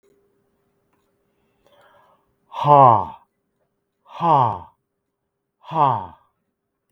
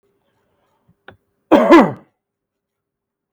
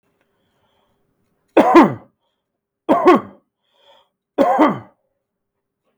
{"exhalation_length": "6.9 s", "exhalation_amplitude": 32768, "exhalation_signal_mean_std_ratio": 0.29, "cough_length": "3.3 s", "cough_amplitude": 32768, "cough_signal_mean_std_ratio": 0.27, "three_cough_length": "6.0 s", "three_cough_amplitude": 32768, "three_cough_signal_mean_std_ratio": 0.32, "survey_phase": "beta (2021-08-13 to 2022-03-07)", "age": "45-64", "gender": "Male", "wearing_mask": "No", "symptom_fatigue": true, "smoker_status": "Never smoked", "respiratory_condition_asthma": false, "respiratory_condition_other": false, "recruitment_source": "REACT", "submission_delay": "6 days", "covid_test_result": "Negative", "covid_test_method": "RT-qPCR", "influenza_a_test_result": "Negative", "influenza_b_test_result": "Negative"}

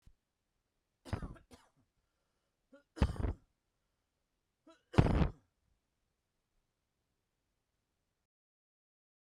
{"three_cough_length": "9.3 s", "three_cough_amplitude": 11712, "three_cough_signal_mean_std_ratio": 0.2, "survey_phase": "beta (2021-08-13 to 2022-03-07)", "age": "18-44", "gender": "Male", "wearing_mask": "No", "symptom_cough_any": true, "symptom_shortness_of_breath": true, "symptom_diarrhoea": true, "symptom_fatigue": true, "symptom_headache": true, "smoker_status": "Never smoked", "respiratory_condition_asthma": false, "respiratory_condition_other": false, "recruitment_source": "REACT", "submission_delay": "1 day", "covid_test_result": "Negative", "covid_test_method": "RT-qPCR"}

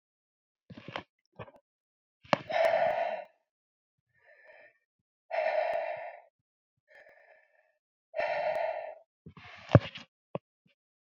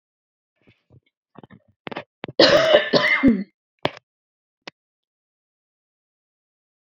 {"exhalation_length": "11.2 s", "exhalation_amplitude": 25403, "exhalation_signal_mean_std_ratio": 0.33, "cough_length": "7.0 s", "cough_amplitude": 30899, "cough_signal_mean_std_ratio": 0.3, "survey_phase": "beta (2021-08-13 to 2022-03-07)", "age": "45-64", "gender": "Female", "wearing_mask": "No", "symptom_none": true, "symptom_onset": "9 days", "smoker_status": "Never smoked", "respiratory_condition_asthma": false, "respiratory_condition_other": false, "recruitment_source": "REACT", "submission_delay": "1 day", "covid_test_result": "Negative", "covid_test_method": "RT-qPCR"}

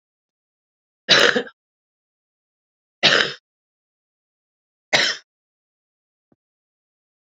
{"three_cough_length": "7.3 s", "three_cough_amplitude": 32768, "three_cough_signal_mean_std_ratio": 0.24, "survey_phase": "beta (2021-08-13 to 2022-03-07)", "age": "45-64", "gender": "Female", "wearing_mask": "No", "symptom_cough_any": true, "symptom_runny_or_blocked_nose": true, "symptom_shortness_of_breath": true, "symptom_diarrhoea": true, "symptom_headache": true, "symptom_onset": "3 days", "smoker_status": "Current smoker (1 to 10 cigarettes per day)", "respiratory_condition_asthma": false, "respiratory_condition_other": false, "recruitment_source": "Test and Trace", "submission_delay": "2 days", "covid_test_result": "Positive", "covid_test_method": "RT-qPCR"}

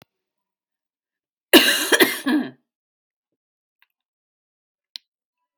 {"cough_length": "5.6 s", "cough_amplitude": 32768, "cough_signal_mean_std_ratio": 0.26, "survey_phase": "beta (2021-08-13 to 2022-03-07)", "age": "45-64", "gender": "Female", "wearing_mask": "No", "symptom_cough_any": true, "symptom_change_to_sense_of_smell_or_taste": true, "symptom_onset": "11 days", "smoker_status": "Ex-smoker", "respiratory_condition_asthma": false, "respiratory_condition_other": false, "recruitment_source": "REACT", "submission_delay": "2 days", "covid_test_result": "Positive", "covid_test_method": "RT-qPCR", "covid_ct_value": 24.0, "covid_ct_gene": "E gene", "influenza_a_test_result": "Negative", "influenza_b_test_result": "Negative"}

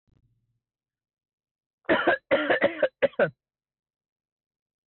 {"three_cough_length": "4.9 s", "three_cough_amplitude": 9470, "three_cough_signal_mean_std_ratio": 0.34, "survey_phase": "beta (2021-08-13 to 2022-03-07)", "age": "18-44", "gender": "Male", "wearing_mask": "No", "symptom_none": true, "smoker_status": "Never smoked", "respiratory_condition_asthma": false, "respiratory_condition_other": false, "recruitment_source": "REACT", "submission_delay": "3 days", "covid_test_result": "Negative", "covid_test_method": "RT-qPCR"}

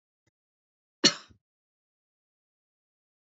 {"cough_length": "3.2 s", "cough_amplitude": 17314, "cough_signal_mean_std_ratio": 0.12, "survey_phase": "beta (2021-08-13 to 2022-03-07)", "age": "45-64", "gender": "Female", "wearing_mask": "No", "symptom_none": true, "smoker_status": "Never smoked", "respiratory_condition_asthma": false, "respiratory_condition_other": false, "recruitment_source": "REACT", "submission_delay": "0 days", "covid_test_result": "Negative", "covid_test_method": "RT-qPCR", "influenza_a_test_result": "Negative", "influenza_b_test_result": "Negative"}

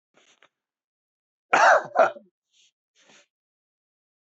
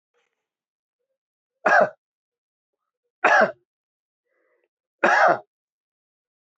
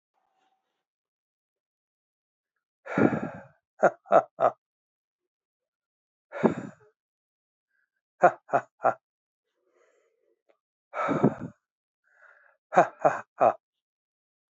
{"cough_length": "4.3 s", "cough_amplitude": 19713, "cough_signal_mean_std_ratio": 0.25, "three_cough_length": "6.6 s", "three_cough_amplitude": 22851, "three_cough_signal_mean_std_ratio": 0.28, "exhalation_length": "14.5 s", "exhalation_amplitude": 18505, "exhalation_signal_mean_std_ratio": 0.25, "survey_phase": "alpha (2021-03-01 to 2021-08-12)", "age": "65+", "gender": "Male", "wearing_mask": "No", "symptom_none": true, "smoker_status": "Ex-smoker", "respiratory_condition_asthma": false, "respiratory_condition_other": false, "recruitment_source": "REACT", "submission_delay": "4 days", "covid_test_result": "Negative", "covid_test_method": "RT-qPCR"}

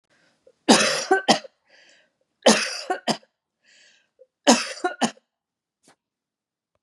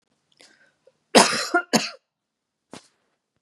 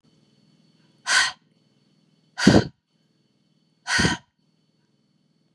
{"three_cough_length": "6.8 s", "three_cough_amplitude": 29869, "three_cough_signal_mean_std_ratio": 0.32, "cough_length": "3.4 s", "cough_amplitude": 32768, "cough_signal_mean_std_ratio": 0.27, "exhalation_length": "5.5 s", "exhalation_amplitude": 31381, "exhalation_signal_mean_std_ratio": 0.27, "survey_phase": "beta (2021-08-13 to 2022-03-07)", "age": "45-64", "gender": "Female", "wearing_mask": "No", "symptom_none": true, "smoker_status": "Never smoked", "respiratory_condition_asthma": false, "respiratory_condition_other": false, "recruitment_source": "Test and Trace", "submission_delay": "1 day", "covid_test_result": "Negative", "covid_test_method": "RT-qPCR"}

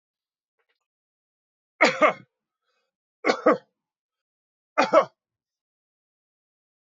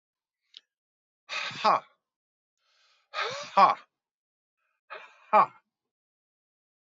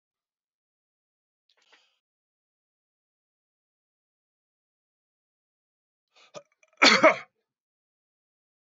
{"three_cough_length": "6.9 s", "three_cough_amplitude": 20833, "three_cough_signal_mean_std_ratio": 0.23, "exhalation_length": "6.9 s", "exhalation_amplitude": 15483, "exhalation_signal_mean_std_ratio": 0.25, "cough_length": "8.6 s", "cough_amplitude": 20716, "cough_signal_mean_std_ratio": 0.14, "survey_phase": "beta (2021-08-13 to 2022-03-07)", "age": "65+", "gender": "Male", "wearing_mask": "No", "symptom_none": true, "smoker_status": "Never smoked", "respiratory_condition_asthma": false, "respiratory_condition_other": false, "recruitment_source": "REACT", "submission_delay": "2 days", "covid_test_result": "Negative", "covid_test_method": "RT-qPCR", "influenza_a_test_result": "Negative", "influenza_b_test_result": "Negative"}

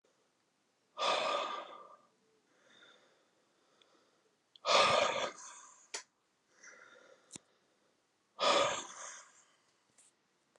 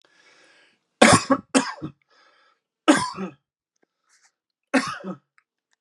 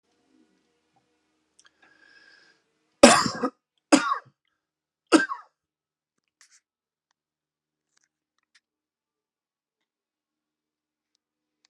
{"exhalation_length": "10.6 s", "exhalation_amplitude": 6216, "exhalation_signal_mean_std_ratio": 0.34, "cough_length": "5.8 s", "cough_amplitude": 32767, "cough_signal_mean_std_ratio": 0.29, "three_cough_length": "11.7 s", "three_cough_amplitude": 32767, "three_cough_signal_mean_std_ratio": 0.16, "survey_phase": "alpha (2021-03-01 to 2021-08-12)", "age": "45-64", "gender": "Male", "wearing_mask": "No", "symptom_cough_any": true, "symptom_abdominal_pain": true, "symptom_headache": true, "smoker_status": "Never smoked", "respiratory_condition_asthma": false, "respiratory_condition_other": false, "recruitment_source": "Test and Trace", "submission_delay": "35 days", "covid_test_result": "Negative", "covid_test_method": "RT-qPCR"}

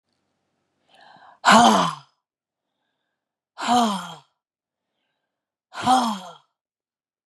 {"cough_length": "7.3 s", "cough_amplitude": 28046, "cough_signal_mean_std_ratio": 0.31, "survey_phase": "beta (2021-08-13 to 2022-03-07)", "age": "45-64", "gender": "Female", "wearing_mask": "No", "symptom_cough_any": true, "symptom_runny_or_blocked_nose": true, "symptom_sore_throat": true, "symptom_headache": true, "symptom_other": true, "symptom_onset": "4 days", "smoker_status": "Never smoked", "respiratory_condition_asthma": false, "respiratory_condition_other": false, "recruitment_source": "Test and Trace", "submission_delay": "2 days", "covid_test_result": "Positive", "covid_test_method": "RT-qPCR", "covid_ct_value": 27.8, "covid_ct_gene": "ORF1ab gene", "covid_ct_mean": 28.2, "covid_viral_load": "560 copies/ml", "covid_viral_load_category": "Minimal viral load (< 10K copies/ml)"}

